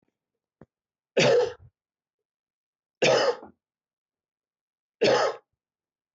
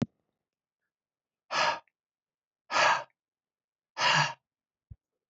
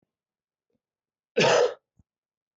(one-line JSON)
{"three_cough_length": "6.1 s", "three_cough_amplitude": 12034, "three_cough_signal_mean_std_ratio": 0.34, "exhalation_length": "5.3 s", "exhalation_amplitude": 8254, "exhalation_signal_mean_std_ratio": 0.33, "cough_length": "2.6 s", "cough_amplitude": 12796, "cough_signal_mean_std_ratio": 0.3, "survey_phase": "beta (2021-08-13 to 2022-03-07)", "age": "45-64", "gender": "Male", "wearing_mask": "No", "symptom_cough_any": true, "symptom_runny_or_blocked_nose": true, "symptom_shortness_of_breath": true, "symptom_fatigue": true, "symptom_fever_high_temperature": true, "symptom_headache": true, "symptom_onset": "5 days", "smoker_status": "Never smoked", "respiratory_condition_asthma": false, "respiratory_condition_other": false, "recruitment_source": "Test and Trace", "submission_delay": "1 day", "covid_test_result": "Positive", "covid_test_method": "RT-qPCR"}